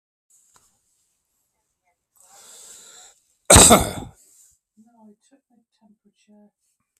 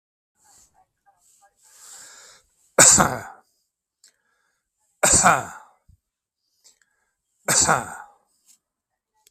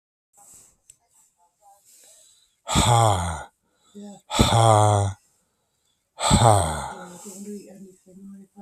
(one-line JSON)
{"cough_length": "7.0 s", "cough_amplitude": 32768, "cough_signal_mean_std_ratio": 0.19, "three_cough_length": "9.3 s", "three_cough_amplitude": 32768, "three_cough_signal_mean_std_ratio": 0.27, "exhalation_length": "8.6 s", "exhalation_amplitude": 32138, "exhalation_signal_mean_std_ratio": 0.41, "survey_phase": "beta (2021-08-13 to 2022-03-07)", "age": "65+", "gender": "Male", "wearing_mask": "No", "symptom_none": true, "smoker_status": "Current smoker (1 to 10 cigarettes per day)", "respiratory_condition_asthma": false, "respiratory_condition_other": false, "recruitment_source": "REACT", "submission_delay": "4 days", "covid_test_result": "Negative", "covid_test_method": "RT-qPCR", "influenza_a_test_result": "Negative", "influenza_b_test_result": "Negative"}